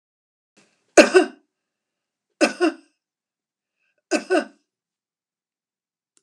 {"three_cough_length": "6.2 s", "three_cough_amplitude": 32768, "three_cough_signal_mean_std_ratio": 0.23, "survey_phase": "beta (2021-08-13 to 2022-03-07)", "age": "65+", "gender": "Female", "wearing_mask": "No", "symptom_none": true, "smoker_status": "Ex-smoker", "respiratory_condition_asthma": false, "respiratory_condition_other": false, "recruitment_source": "REACT", "submission_delay": "0 days", "covid_test_result": "Negative", "covid_test_method": "RT-qPCR", "influenza_a_test_result": "Negative", "influenza_b_test_result": "Negative"}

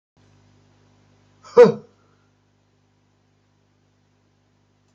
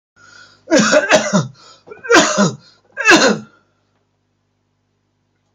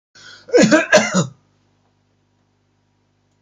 {"exhalation_length": "4.9 s", "exhalation_amplitude": 27097, "exhalation_signal_mean_std_ratio": 0.15, "three_cough_length": "5.5 s", "three_cough_amplitude": 32528, "three_cough_signal_mean_std_ratio": 0.43, "cough_length": "3.4 s", "cough_amplitude": 29405, "cough_signal_mean_std_ratio": 0.35, "survey_phase": "beta (2021-08-13 to 2022-03-07)", "age": "65+", "gender": "Male", "wearing_mask": "No", "symptom_cough_any": true, "symptom_runny_or_blocked_nose": true, "symptom_shortness_of_breath": true, "symptom_fatigue": true, "symptom_fever_high_temperature": true, "symptom_other": true, "smoker_status": "Never smoked", "respiratory_condition_asthma": true, "respiratory_condition_other": false, "recruitment_source": "Test and Trace", "submission_delay": "0 days", "covid_test_result": "Positive", "covid_test_method": "LFT"}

